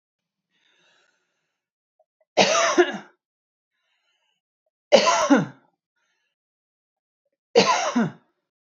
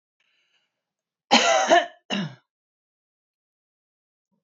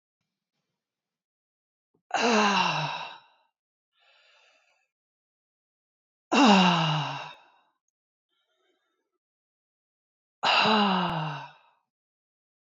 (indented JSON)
{
  "three_cough_length": "8.8 s",
  "three_cough_amplitude": 27257,
  "three_cough_signal_mean_std_ratio": 0.32,
  "cough_length": "4.4 s",
  "cough_amplitude": 25374,
  "cough_signal_mean_std_ratio": 0.3,
  "exhalation_length": "12.7 s",
  "exhalation_amplitude": 14448,
  "exhalation_signal_mean_std_ratio": 0.36,
  "survey_phase": "beta (2021-08-13 to 2022-03-07)",
  "age": "45-64",
  "gender": "Female",
  "wearing_mask": "No",
  "symptom_none": true,
  "smoker_status": "Never smoked",
  "respiratory_condition_asthma": false,
  "respiratory_condition_other": false,
  "recruitment_source": "REACT",
  "submission_delay": "3 days",
  "covid_test_result": "Negative",
  "covid_test_method": "RT-qPCR",
  "influenza_a_test_result": "Negative",
  "influenza_b_test_result": "Negative"
}